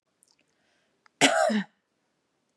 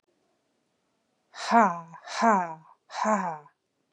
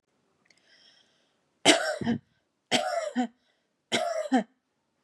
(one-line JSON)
{"cough_length": "2.6 s", "cough_amplitude": 23901, "cough_signal_mean_std_ratio": 0.32, "exhalation_length": "3.9 s", "exhalation_amplitude": 18078, "exhalation_signal_mean_std_ratio": 0.39, "three_cough_length": "5.0 s", "three_cough_amplitude": 21343, "three_cough_signal_mean_std_ratio": 0.39, "survey_phase": "beta (2021-08-13 to 2022-03-07)", "age": "45-64", "gender": "Female", "wearing_mask": "No", "symptom_none": true, "smoker_status": "Never smoked", "respiratory_condition_asthma": false, "respiratory_condition_other": false, "recruitment_source": "Test and Trace", "submission_delay": "2 days", "covid_test_result": "Negative", "covid_test_method": "RT-qPCR"}